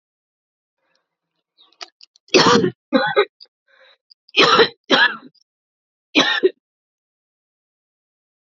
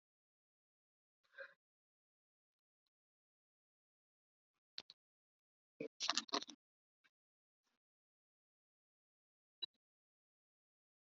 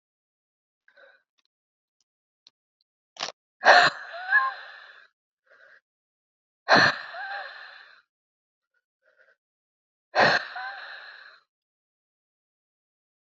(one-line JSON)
{"three_cough_length": "8.4 s", "three_cough_amplitude": 31274, "three_cough_signal_mean_std_ratio": 0.33, "cough_length": "11.1 s", "cough_amplitude": 4163, "cough_signal_mean_std_ratio": 0.13, "exhalation_length": "13.2 s", "exhalation_amplitude": 26910, "exhalation_signal_mean_std_ratio": 0.25, "survey_phase": "alpha (2021-03-01 to 2021-08-12)", "age": "45-64", "gender": "Female", "wearing_mask": "No", "symptom_cough_any": true, "symptom_new_continuous_cough": true, "symptom_shortness_of_breath": true, "symptom_abdominal_pain": true, "symptom_fatigue": true, "symptom_headache": true, "symptom_loss_of_taste": true, "symptom_onset": "3 days", "smoker_status": "Ex-smoker", "respiratory_condition_asthma": false, "respiratory_condition_other": false, "recruitment_source": "Test and Trace", "submission_delay": "2 days", "covid_test_result": "Positive", "covid_test_method": "RT-qPCR"}